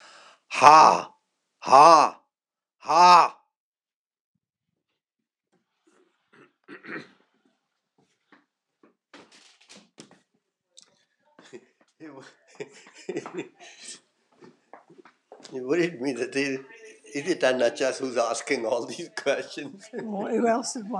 {"exhalation_length": "21.0 s", "exhalation_amplitude": 26028, "exhalation_signal_mean_std_ratio": 0.32, "survey_phase": "alpha (2021-03-01 to 2021-08-12)", "age": "65+", "gender": "Male", "wearing_mask": "No", "symptom_none": true, "smoker_status": "Never smoked", "respiratory_condition_asthma": false, "respiratory_condition_other": false, "recruitment_source": "REACT", "submission_delay": "1 day", "covid_test_result": "Negative", "covid_test_method": "RT-qPCR"}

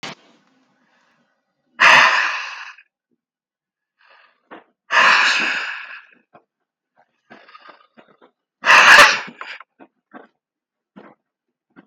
{"exhalation_length": "11.9 s", "exhalation_amplitude": 32768, "exhalation_signal_mean_std_ratio": 0.32, "survey_phase": "beta (2021-08-13 to 2022-03-07)", "age": "45-64", "gender": "Male", "wearing_mask": "No", "symptom_none": true, "smoker_status": "Ex-smoker", "respiratory_condition_asthma": false, "respiratory_condition_other": false, "recruitment_source": "REACT", "submission_delay": "4 days", "covid_test_result": "Negative", "covid_test_method": "RT-qPCR", "influenza_a_test_result": "Negative", "influenza_b_test_result": "Negative"}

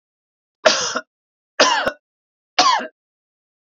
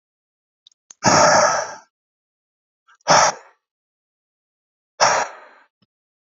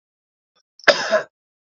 {"three_cough_length": "3.8 s", "three_cough_amplitude": 31787, "three_cough_signal_mean_std_ratio": 0.37, "exhalation_length": "6.3 s", "exhalation_amplitude": 29015, "exhalation_signal_mean_std_ratio": 0.34, "cough_length": "1.8 s", "cough_amplitude": 28350, "cough_signal_mean_std_ratio": 0.28, "survey_phase": "beta (2021-08-13 to 2022-03-07)", "age": "45-64", "gender": "Male", "wearing_mask": "No", "symptom_none": true, "smoker_status": "Ex-smoker", "respiratory_condition_asthma": false, "respiratory_condition_other": false, "recruitment_source": "REACT", "submission_delay": "4 days", "covid_test_result": "Negative", "covid_test_method": "RT-qPCR"}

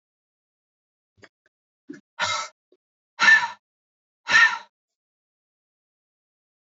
{"exhalation_length": "6.7 s", "exhalation_amplitude": 20506, "exhalation_signal_mean_std_ratio": 0.25, "survey_phase": "beta (2021-08-13 to 2022-03-07)", "age": "45-64", "gender": "Female", "wearing_mask": "No", "symptom_cough_any": true, "symptom_runny_or_blocked_nose": true, "symptom_sore_throat": true, "symptom_fatigue": true, "symptom_headache": true, "smoker_status": "Current smoker (1 to 10 cigarettes per day)", "respiratory_condition_asthma": false, "respiratory_condition_other": false, "recruitment_source": "Test and Trace", "submission_delay": "2 days", "covid_test_result": "Positive", "covid_test_method": "RT-qPCR", "covid_ct_value": 30.5, "covid_ct_gene": "ORF1ab gene", "covid_ct_mean": 31.7, "covid_viral_load": "39 copies/ml", "covid_viral_load_category": "Minimal viral load (< 10K copies/ml)"}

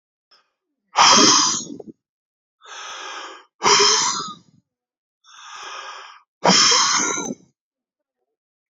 {"exhalation_length": "8.7 s", "exhalation_amplitude": 31819, "exhalation_signal_mean_std_ratio": 0.43, "survey_phase": "beta (2021-08-13 to 2022-03-07)", "age": "45-64", "gender": "Male", "wearing_mask": "No", "symptom_none": true, "smoker_status": "Current smoker (11 or more cigarettes per day)", "respiratory_condition_asthma": false, "respiratory_condition_other": false, "recruitment_source": "REACT", "submission_delay": "0 days", "covid_test_result": "Negative", "covid_test_method": "RT-qPCR"}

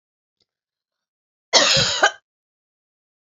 {"cough_length": "3.2 s", "cough_amplitude": 29494, "cough_signal_mean_std_ratio": 0.32, "survey_phase": "beta (2021-08-13 to 2022-03-07)", "age": "65+", "gender": "Female", "wearing_mask": "No", "symptom_none": true, "smoker_status": "Never smoked", "respiratory_condition_asthma": false, "respiratory_condition_other": false, "recruitment_source": "REACT", "submission_delay": "2 days", "covid_test_result": "Negative", "covid_test_method": "RT-qPCR", "influenza_a_test_result": "Negative", "influenza_b_test_result": "Negative"}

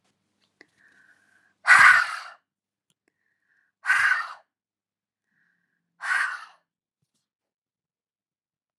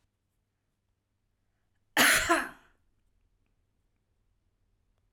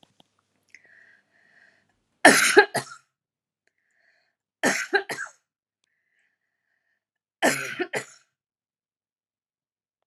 {"exhalation_length": "8.8 s", "exhalation_amplitude": 24267, "exhalation_signal_mean_std_ratio": 0.26, "cough_length": "5.1 s", "cough_amplitude": 11492, "cough_signal_mean_std_ratio": 0.24, "three_cough_length": "10.1 s", "three_cough_amplitude": 32651, "three_cough_signal_mean_std_ratio": 0.23, "survey_phase": "alpha (2021-03-01 to 2021-08-12)", "age": "45-64", "gender": "Female", "wearing_mask": "No", "symptom_none": true, "smoker_status": "Never smoked", "respiratory_condition_asthma": false, "respiratory_condition_other": false, "recruitment_source": "REACT", "submission_delay": "7 days", "covid_test_result": "Negative", "covid_test_method": "RT-qPCR"}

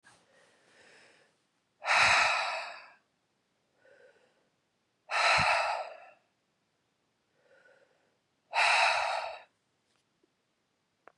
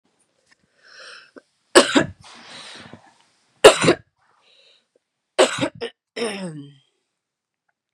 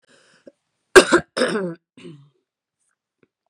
{"exhalation_length": "11.2 s", "exhalation_amplitude": 8717, "exhalation_signal_mean_std_ratio": 0.37, "three_cough_length": "7.9 s", "three_cough_amplitude": 32768, "three_cough_signal_mean_std_ratio": 0.25, "cough_length": "3.5 s", "cough_amplitude": 32768, "cough_signal_mean_std_ratio": 0.24, "survey_phase": "beta (2021-08-13 to 2022-03-07)", "age": "45-64", "gender": "Female", "wearing_mask": "No", "symptom_runny_or_blocked_nose": true, "symptom_fatigue": true, "symptom_headache": true, "symptom_change_to_sense_of_smell_or_taste": true, "symptom_onset": "5 days", "smoker_status": "Ex-smoker", "respiratory_condition_asthma": false, "respiratory_condition_other": false, "recruitment_source": "Test and Trace", "submission_delay": "4 days", "covid_test_result": "Positive", "covid_test_method": "RT-qPCR", "covid_ct_value": 24.6, "covid_ct_gene": "ORF1ab gene"}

